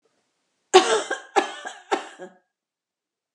{"cough_length": "3.3 s", "cough_amplitude": 32767, "cough_signal_mean_std_ratio": 0.3, "survey_phase": "alpha (2021-03-01 to 2021-08-12)", "age": "65+", "gender": "Female", "wearing_mask": "No", "symptom_none": true, "smoker_status": "Ex-smoker", "respiratory_condition_asthma": false, "respiratory_condition_other": false, "recruitment_source": "REACT", "submission_delay": "1 day", "covid_test_result": "Negative", "covid_test_method": "RT-qPCR"}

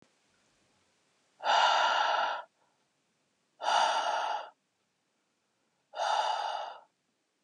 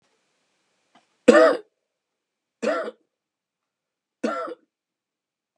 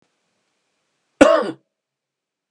{"exhalation_length": "7.4 s", "exhalation_amplitude": 6585, "exhalation_signal_mean_std_ratio": 0.49, "three_cough_length": "5.6 s", "three_cough_amplitude": 32685, "three_cough_signal_mean_std_ratio": 0.24, "cough_length": "2.5 s", "cough_amplitude": 32768, "cough_signal_mean_std_ratio": 0.24, "survey_phase": "beta (2021-08-13 to 2022-03-07)", "age": "18-44", "gender": "Male", "wearing_mask": "No", "symptom_none": true, "smoker_status": "Never smoked", "respiratory_condition_asthma": false, "respiratory_condition_other": false, "recruitment_source": "REACT", "submission_delay": "4 days", "covid_test_result": "Negative", "covid_test_method": "RT-qPCR", "influenza_a_test_result": "Negative", "influenza_b_test_result": "Negative"}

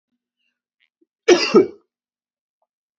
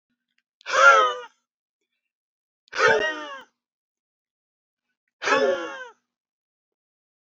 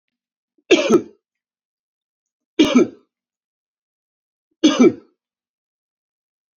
{"cough_length": "3.0 s", "cough_amplitude": 30385, "cough_signal_mean_std_ratio": 0.25, "exhalation_length": "7.3 s", "exhalation_amplitude": 25029, "exhalation_signal_mean_std_ratio": 0.33, "three_cough_length": "6.6 s", "three_cough_amplitude": 28641, "three_cough_signal_mean_std_ratio": 0.27, "survey_phase": "alpha (2021-03-01 to 2021-08-12)", "age": "45-64", "gender": "Male", "wearing_mask": "No", "symptom_cough_any": true, "symptom_fatigue": true, "symptom_change_to_sense_of_smell_or_taste": true, "symptom_loss_of_taste": true, "symptom_onset": "7 days", "smoker_status": "Ex-smoker", "respiratory_condition_asthma": false, "respiratory_condition_other": false, "recruitment_source": "Test and Trace", "submission_delay": "2 days", "covid_test_result": "Positive", "covid_test_method": "RT-qPCR", "covid_ct_value": 24.0, "covid_ct_gene": "N gene"}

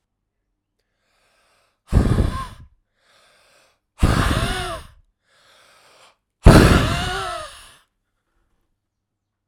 {"exhalation_length": "9.5 s", "exhalation_amplitude": 32768, "exhalation_signal_mean_std_ratio": 0.32, "survey_phase": "alpha (2021-03-01 to 2021-08-12)", "age": "18-44", "gender": "Male", "wearing_mask": "No", "symptom_cough_any": true, "symptom_shortness_of_breath": true, "symptom_change_to_sense_of_smell_or_taste": true, "symptom_loss_of_taste": true, "symptom_onset": "4 days", "smoker_status": "Never smoked", "respiratory_condition_asthma": false, "respiratory_condition_other": false, "recruitment_source": "Test and Trace", "submission_delay": "1 day", "covid_test_result": "Positive", "covid_test_method": "RT-qPCR", "covid_ct_value": 15.5, "covid_ct_gene": "ORF1ab gene"}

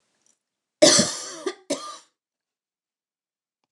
{"cough_length": "3.7 s", "cough_amplitude": 27990, "cough_signal_mean_std_ratio": 0.27, "survey_phase": "beta (2021-08-13 to 2022-03-07)", "age": "45-64", "gender": "Female", "wearing_mask": "No", "symptom_none": true, "smoker_status": "Never smoked", "respiratory_condition_asthma": false, "respiratory_condition_other": false, "recruitment_source": "REACT", "submission_delay": "1 day", "covid_test_result": "Negative", "covid_test_method": "RT-qPCR"}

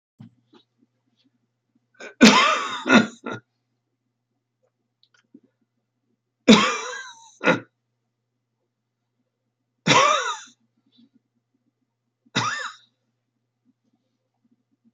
{"three_cough_length": "14.9 s", "three_cough_amplitude": 29793, "three_cough_signal_mean_std_ratio": 0.26, "survey_phase": "beta (2021-08-13 to 2022-03-07)", "age": "65+", "gender": "Male", "wearing_mask": "No", "symptom_none": true, "smoker_status": "Never smoked", "respiratory_condition_asthma": false, "respiratory_condition_other": false, "recruitment_source": "REACT", "submission_delay": "4 days", "covid_test_result": "Negative", "covid_test_method": "RT-qPCR", "influenza_a_test_result": "Negative", "influenza_b_test_result": "Negative"}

